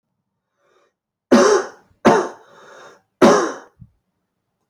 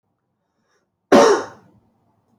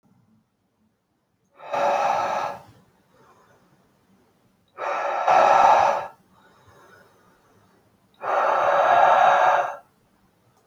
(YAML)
three_cough_length: 4.7 s
three_cough_amplitude: 29201
three_cough_signal_mean_std_ratio: 0.35
cough_length: 2.4 s
cough_amplitude: 26464
cough_signal_mean_std_ratio: 0.29
exhalation_length: 10.7 s
exhalation_amplitude: 21299
exhalation_signal_mean_std_ratio: 0.48
survey_phase: beta (2021-08-13 to 2022-03-07)
age: 18-44
gender: Male
wearing_mask: 'No'
symptom_cough_any: true
symptom_runny_or_blocked_nose: true
symptom_change_to_sense_of_smell_or_taste: true
symptom_loss_of_taste: true
smoker_status: Never smoked
respiratory_condition_asthma: false
respiratory_condition_other: false
recruitment_source: Test and Trace
submission_delay: 2 days
covid_test_result: Positive
covid_test_method: RT-qPCR